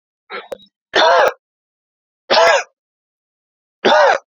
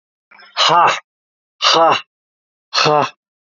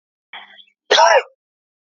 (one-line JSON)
{"three_cough_length": "4.4 s", "three_cough_amplitude": 30533, "three_cough_signal_mean_std_ratio": 0.42, "exhalation_length": "3.5 s", "exhalation_amplitude": 32272, "exhalation_signal_mean_std_ratio": 0.47, "cough_length": "1.9 s", "cough_amplitude": 28098, "cough_signal_mean_std_ratio": 0.35, "survey_phase": "beta (2021-08-13 to 2022-03-07)", "age": "18-44", "gender": "Male", "wearing_mask": "No", "symptom_cough_any": true, "symptom_runny_or_blocked_nose": true, "symptom_sore_throat": true, "symptom_onset": "3 days", "smoker_status": "Never smoked", "respiratory_condition_asthma": false, "respiratory_condition_other": false, "recruitment_source": "Test and Trace", "submission_delay": "2 days", "covid_test_result": "Positive", "covid_test_method": "RT-qPCR", "covid_ct_value": 22.1, "covid_ct_gene": "ORF1ab gene", "covid_ct_mean": 22.6, "covid_viral_load": "39000 copies/ml", "covid_viral_load_category": "Low viral load (10K-1M copies/ml)"}